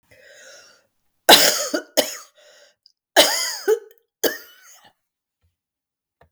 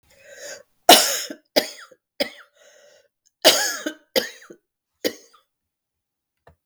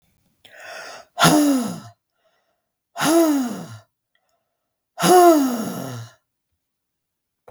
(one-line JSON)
{"three_cough_length": "6.3 s", "three_cough_amplitude": 32768, "three_cough_signal_mean_std_ratio": 0.3, "cough_length": "6.7 s", "cough_amplitude": 32768, "cough_signal_mean_std_ratio": 0.27, "exhalation_length": "7.5 s", "exhalation_amplitude": 32766, "exhalation_signal_mean_std_ratio": 0.42, "survey_phase": "beta (2021-08-13 to 2022-03-07)", "age": "45-64", "gender": "Female", "wearing_mask": "No", "symptom_cough_any": true, "symptom_new_continuous_cough": true, "symptom_runny_or_blocked_nose": true, "symptom_sore_throat": true, "symptom_headache": true, "symptom_onset": "1 day", "smoker_status": "Never smoked", "respiratory_condition_asthma": false, "respiratory_condition_other": false, "recruitment_source": "Test and Trace", "submission_delay": "1 day", "covid_test_result": "Positive", "covid_test_method": "RT-qPCR"}